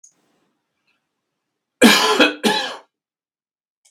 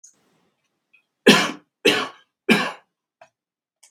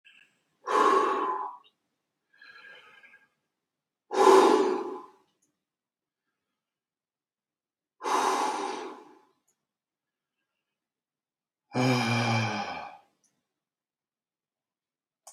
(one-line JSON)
{"cough_length": "3.9 s", "cough_amplitude": 32768, "cough_signal_mean_std_ratio": 0.33, "three_cough_length": "3.9 s", "three_cough_amplitude": 32768, "three_cough_signal_mean_std_ratio": 0.29, "exhalation_length": "15.3 s", "exhalation_amplitude": 16296, "exhalation_signal_mean_std_ratio": 0.36, "survey_phase": "beta (2021-08-13 to 2022-03-07)", "age": "45-64", "gender": "Male", "wearing_mask": "No", "symptom_none": true, "symptom_onset": "4 days", "smoker_status": "Ex-smoker", "respiratory_condition_asthma": false, "respiratory_condition_other": false, "recruitment_source": "REACT", "submission_delay": "0 days", "covid_test_result": "Negative", "covid_test_method": "RT-qPCR"}